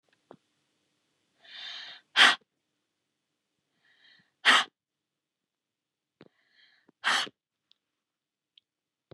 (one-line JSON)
{"exhalation_length": "9.1 s", "exhalation_amplitude": 18334, "exhalation_signal_mean_std_ratio": 0.2, "survey_phase": "beta (2021-08-13 to 2022-03-07)", "age": "45-64", "gender": "Female", "wearing_mask": "No", "symptom_none": true, "smoker_status": "Ex-smoker", "respiratory_condition_asthma": false, "respiratory_condition_other": false, "recruitment_source": "REACT", "submission_delay": "1 day", "covid_test_result": "Negative", "covid_test_method": "RT-qPCR", "influenza_a_test_result": "Negative", "influenza_b_test_result": "Negative"}